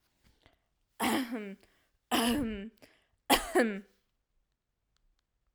{"three_cough_length": "5.5 s", "three_cough_amplitude": 11312, "three_cough_signal_mean_std_ratio": 0.39, "survey_phase": "alpha (2021-03-01 to 2021-08-12)", "age": "18-44", "gender": "Female", "wearing_mask": "No", "symptom_none": true, "smoker_status": "Never smoked", "respiratory_condition_asthma": false, "respiratory_condition_other": false, "recruitment_source": "REACT", "submission_delay": "1 day", "covid_test_result": "Negative", "covid_test_method": "RT-qPCR"}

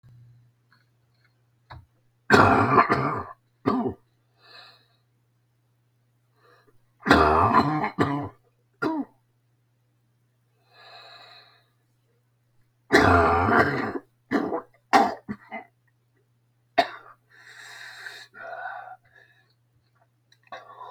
{"three_cough_length": "20.9 s", "three_cough_amplitude": 30604, "three_cough_signal_mean_std_ratio": 0.36, "survey_phase": "beta (2021-08-13 to 2022-03-07)", "age": "65+", "gender": "Male", "wearing_mask": "No", "symptom_cough_any": true, "symptom_runny_or_blocked_nose": true, "symptom_shortness_of_breath": true, "symptom_change_to_sense_of_smell_or_taste": true, "symptom_loss_of_taste": true, "smoker_status": "Current smoker (1 to 10 cigarettes per day)", "respiratory_condition_asthma": false, "respiratory_condition_other": true, "recruitment_source": "REACT", "submission_delay": "2 days", "covid_test_result": "Negative", "covid_test_method": "RT-qPCR", "influenza_a_test_result": "Negative", "influenza_b_test_result": "Negative"}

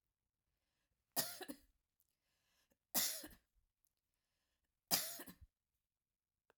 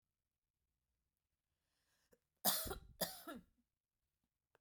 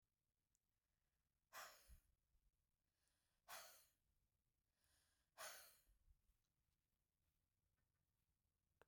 {"three_cough_length": "6.6 s", "three_cough_amplitude": 4429, "three_cough_signal_mean_std_ratio": 0.26, "cough_length": "4.6 s", "cough_amplitude": 3332, "cough_signal_mean_std_ratio": 0.25, "exhalation_length": "8.9 s", "exhalation_amplitude": 215, "exhalation_signal_mean_std_ratio": 0.32, "survey_phase": "beta (2021-08-13 to 2022-03-07)", "age": "45-64", "gender": "Female", "wearing_mask": "No", "symptom_sore_throat": true, "symptom_fatigue": true, "smoker_status": "Never smoked", "respiratory_condition_asthma": false, "respiratory_condition_other": false, "recruitment_source": "REACT", "submission_delay": "1 day", "covid_test_result": "Negative", "covid_test_method": "RT-qPCR"}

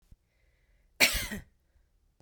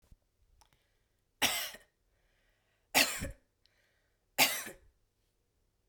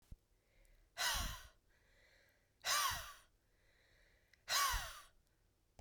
{"cough_length": "2.2 s", "cough_amplitude": 15094, "cough_signal_mean_std_ratio": 0.27, "three_cough_length": "5.9 s", "three_cough_amplitude": 8887, "three_cough_signal_mean_std_ratio": 0.27, "exhalation_length": "5.8 s", "exhalation_amplitude": 2027, "exhalation_signal_mean_std_ratio": 0.4, "survey_phase": "beta (2021-08-13 to 2022-03-07)", "age": "18-44", "gender": "Female", "wearing_mask": "No", "symptom_change_to_sense_of_smell_or_taste": true, "smoker_status": "Never smoked", "respiratory_condition_asthma": false, "respiratory_condition_other": false, "recruitment_source": "Test and Trace", "submission_delay": "1 day", "covid_test_result": "Negative", "covid_test_method": "LAMP"}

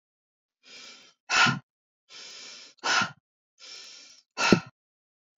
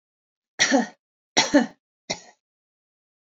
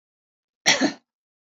{"exhalation_length": "5.4 s", "exhalation_amplitude": 23682, "exhalation_signal_mean_std_ratio": 0.31, "three_cough_length": "3.3 s", "three_cough_amplitude": 24451, "three_cough_signal_mean_std_ratio": 0.3, "cough_length": "1.5 s", "cough_amplitude": 25737, "cough_signal_mean_std_ratio": 0.3, "survey_phase": "beta (2021-08-13 to 2022-03-07)", "age": "45-64", "gender": "Female", "wearing_mask": "No", "symptom_none": true, "smoker_status": "Never smoked", "respiratory_condition_asthma": false, "respiratory_condition_other": false, "recruitment_source": "REACT", "submission_delay": "1 day", "covid_test_result": "Negative", "covid_test_method": "RT-qPCR"}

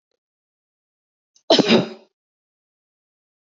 {"cough_length": "3.4 s", "cough_amplitude": 27778, "cough_signal_mean_std_ratio": 0.24, "survey_phase": "beta (2021-08-13 to 2022-03-07)", "age": "45-64", "gender": "Female", "wearing_mask": "No", "symptom_none": true, "smoker_status": "Ex-smoker", "respiratory_condition_asthma": false, "respiratory_condition_other": false, "recruitment_source": "REACT", "submission_delay": "1 day", "covid_test_result": "Negative", "covid_test_method": "RT-qPCR", "covid_ct_value": 38.9, "covid_ct_gene": "N gene", "influenza_a_test_result": "Negative", "influenza_b_test_result": "Negative"}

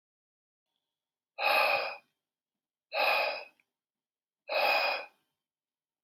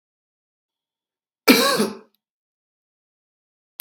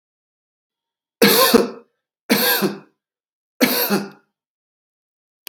{"exhalation_length": "6.0 s", "exhalation_amplitude": 6161, "exhalation_signal_mean_std_ratio": 0.42, "cough_length": "3.8 s", "cough_amplitude": 32768, "cough_signal_mean_std_ratio": 0.24, "three_cough_length": "5.5 s", "three_cough_amplitude": 32768, "three_cough_signal_mean_std_ratio": 0.38, "survey_phase": "beta (2021-08-13 to 2022-03-07)", "age": "18-44", "gender": "Male", "wearing_mask": "No", "symptom_cough_any": true, "symptom_runny_or_blocked_nose": true, "symptom_sore_throat": true, "symptom_fatigue": true, "symptom_onset": "6 days", "smoker_status": "Never smoked", "respiratory_condition_asthma": false, "respiratory_condition_other": false, "recruitment_source": "Test and Trace", "submission_delay": "2 days", "covid_test_result": "Positive", "covid_test_method": "RT-qPCR", "covid_ct_value": 21.3, "covid_ct_gene": "N gene"}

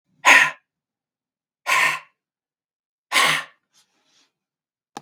{"exhalation_length": "5.0 s", "exhalation_amplitude": 32747, "exhalation_signal_mean_std_ratio": 0.31, "survey_phase": "beta (2021-08-13 to 2022-03-07)", "age": "45-64", "gender": "Male", "wearing_mask": "No", "symptom_cough_any": true, "symptom_runny_or_blocked_nose": true, "symptom_sore_throat": true, "symptom_fatigue": true, "smoker_status": "Never smoked", "respiratory_condition_asthma": false, "respiratory_condition_other": false, "recruitment_source": "Test and Trace", "submission_delay": "1 day", "covid_test_result": "Positive", "covid_test_method": "RT-qPCR", "covid_ct_value": 19.8, "covid_ct_gene": "N gene"}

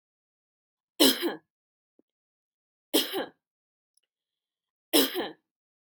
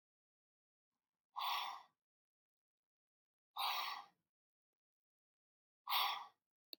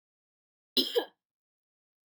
{"three_cough_length": "5.9 s", "three_cough_amplitude": 15536, "three_cough_signal_mean_std_ratio": 0.27, "exhalation_length": "6.8 s", "exhalation_amplitude": 1814, "exhalation_signal_mean_std_ratio": 0.33, "cough_length": "2.0 s", "cough_amplitude": 7581, "cough_signal_mean_std_ratio": 0.24, "survey_phase": "beta (2021-08-13 to 2022-03-07)", "age": "18-44", "gender": "Female", "wearing_mask": "No", "symptom_runny_or_blocked_nose": true, "symptom_change_to_sense_of_smell_or_taste": true, "symptom_onset": "12 days", "smoker_status": "Ex-smoker", "respiratory_condition_asthma": true, "respiratory_condition_other": true, "recruitment_source": "REACT", "submission_delay": "-2 days", "covid_test_result": "Negative", "covid_test_method": "RT-qPCR", "influenza_a_test_result": "Negative", "influenza_b_test_result": "Negative"}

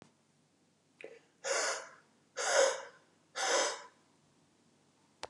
{"exhalation_length": "5.3 s", "exhalation_amplitude": 5588, "exhalation_signal_mean_std_ratio": 0.4, "survey_phase": "beta (2021-08-13 to 2022-03-07)", "age": "45-64", "gender": "Male", "wearing_mask": "No", "symptom_cough_any": true, "symptom_new_continuous_cough": true, "symptom_runny_or_blocked_nose": true, "symptom_sore_throat": true, "symptom_other": true, "symptom_onset": "4 days", "smoker_status": "Ex-smoker", "respiratory_condition_asthma": false, "respiratory_condition_other": false, "recruitment_source": "Test and Trace", "submission_delay": "2 days", "covid_test_result": "Positive", "covid_test_method": "RT-qPCR", "covid_ct_value": 15.2, "covid_ct_gene": "S gene", "covid_ct_mean": 15.6, "covid_viral_load": "7800000 copies/ml", "covid_viral_load_category": "High viral load (>1M copies/ml)"}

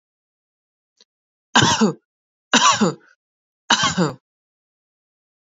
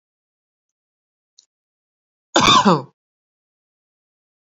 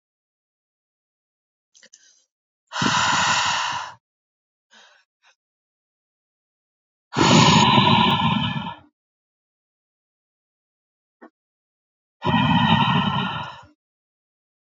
{"three_cough_length": "5.5 s", "three_cough_amplitude": 32767, "three_cough_signal_mean_std_ratio": 0.35, "cough_length": "4.5 s", "cough_amplitude": 29377, "cough_signal_mean_std_ratio": 0.24, "exhalation_length": "14.8 s", "exhalation_amplitude": 25098, "exhalation_signal_mean_std_ratio": 0.41, "survey_phase": "beta (2021-08-13 to 2022-03-07)", "age": "18-44", "gender": "Female", "wearing_mask": "No", "symptom_none": true, "smoker_status": "Ex-smoker", "respiratory_condition_asthma": false, "respiratory_condition_other": false, "recruitment_source": "REACT", "submission_delay": "1 day", "covid_test_result": "Negative", "covid_test_method": "RT-qPCR", "influenza_a_test_result": "Negative", "influenza_b_test_result": "Negative"}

